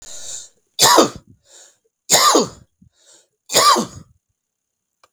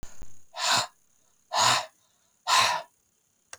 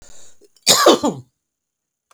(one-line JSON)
{"three_cough_length": "5.1 s", "three_cough_amplitude": 32768, "three_cough_signal_mean_std_ratio": 0.38, "exhalation_length": "3.6 s", "exhalation_amplitude": 11743, "exhalation_signal_mean_std_ratio": 0.48, "cough_length": "2.1 s", "cough_amplitude": 32768, "cough_signal_mean_std_ratio": 0.37, "survey_phase": "beta (2021-08-13 to 2022-03-07)", "age": "65+", "gender": "Male", "wearing_mask": "No", "symptom_none": true, "smoker_status": "Never smoked", "respiratory_condition_asthma": false, "respiratory_condition_other": false, "recruitment_source": "REACT", "submission_delay": "2 days", "covid_test_result": "Negative", "covid_test_method": "RT-qPCR", "influenza_a_test_result": "Negative", "influenza_b_test_result": "Negative"}